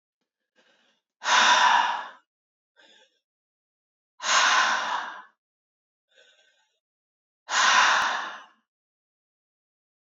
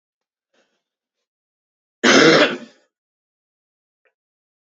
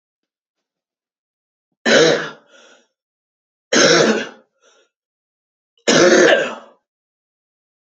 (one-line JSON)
{"exhalation_length": "10.1 s", "exhalation_amplitude": 16708, "exhalation_signal_mean_std_ratio": 0.39, "cough_length": "4.6 s", "cough_amplitude": 30144, "cough_signal_mean_std_ratio": 0.26, "three_cough_length": "7.9 s", "three_cough_amplitude": 32200, "three_cough_signal_mean_std_ratio": 0.36, "survey_phase": "beta (2021-08-13 to 2022-03-07)", "age": "18-44", "gender": "Male", "wearing_mask": "No", "symptom_cough_any": true, "symptom_runny_or_blocked_nose": true, "symptom_shortness_of_breath": true, "symptom_sore_throat": true, "symptom_fatigue": true, "symptom_fever_high_temperature": true, "symptom_headache": true, "symptom_change_to_sense_of_smell_or_taste": true, "symptom_onset": "3 days", "smoker_status": "Never smoked", "respiratory_condition_asthma": false, "respiratory_condition_other": false, "recruitment_source": "Test and Trace", "submission_delay": "2 days", "covid_test_result": "Positive", "covid_test_method": "ePCR"}